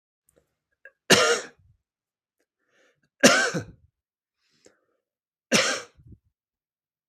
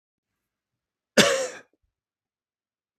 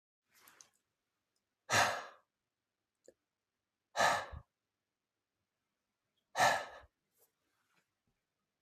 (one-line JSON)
{"three_cough_length": "7.1 s", "three_cough_amplitude": 32568, "three_cough_signal_mean_std_ratio": 0.27, "cough_length": "3.0 s", "cough_amplitude": 32766, "cough_signal_mean_std_ratio": 0.23, "exhalation_length": "8.6 s", "exhalation_amplitude": 4996, "exhalation_signal_mean_std_ratio": 0.25, "survey_phase": "beta (2021-08-13 to 2022-03-07)", "age": "45-64", "gender": "Male", "wearing_mask": "No", "symptom_none": true, "smoker_status": "Never smoked", "respiratory_condition_asthma": false, "respiratory_condition_other": false, "recruitment_source": "Test and Trace", "submission_delay": "-1 day", "covid_test_result": "Negative", "covid_test_method": "LFT"}